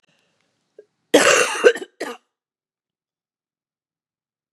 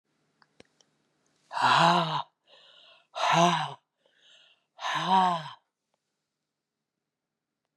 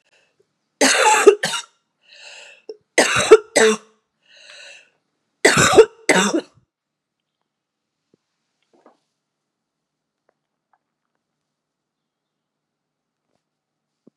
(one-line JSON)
{"cough_length": "4.5 s", "cough_amplitude": 32768, "cough_signal_mean_std_ratio": 0.27, "exhalation_length": "7.8 s", "exhalation_amplitude": 12272, "exhalation_signal_mean_std_ratio": 0.38, "three_cough_length": "14.2 s", "three_cough_amplitude": 32768, "three_cough_signal_mean_std_ratio": 0.27, "survey_phase": "beta (2021-08-13 to 2022-03-07)", "age": "45-64", "gender": "Female", "wearing_mask": "No", "symptom_cough_any": true, "symptom_runny_or_blocked_nose": true, "symptom_onset": "4 days", "smoker_status": "Ex-smoker", "respiratory_condition_asthma": false, "respiratory_condition_other": false, "recruitment_source": "Test and Trace", "submission_delay": "2 days", "covid_test_result": "Positive", "covid_test_method": "RT-qPCR", "covid_ct_value": 18.2, "covid_ct_gene": "ORF1ab gene"}